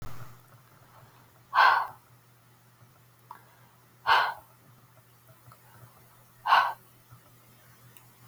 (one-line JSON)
{"exhalation_length": "8.3 s", "exhalation_amplitude": 14181, "exhalation_signal_mean_std_ratio": 0.3, "survey_phase": "beta (2021-08-13 to 2022-03-07)", "age": "45-64", "gender": "Female", "wearing_mask": "No", "symptom_fatigue": true, "symptom_headache": true, "symptom_onset": "12 days", "smoker_status": "Never smoked", "respiratory_condition_asthma": false, "respiratory_condition_other": false, "recruitment_source": "REACT", "submission_delay": "3 days", "covid_test_result": "Negative", "covid_test_method": "RT-qPCR"}